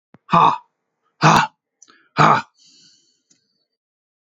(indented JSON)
{
  "exhalation_length": "4.4 s",
  "exhalation_amplitude": 32768,
  "exhalation_signal_mean_std_ratio": 0.32,
  "survey_phase": "beta (2021-08-13 to 2022-03-07)",
  "age": "45-64",
  "gender": "Male",
  "wearing_mask": "No",
  "symptom_cough_any": true,
  "symptom_runny_or_blocked_nose": true,
  "symptom_sore_throat": true,
  "symptom_fatigue": true,
  "symptom_headache": true,
  "smoker_status": "Ex-smoker",
  "respiratory_condition_asthma": false,
  "respiratory_condition_other": false,
  "recruitment_source": "Test and Trace",
  "submission_delay": "2 days",
  "covid_test_result": "Positive",
  "covid_test_method": "LFT"
}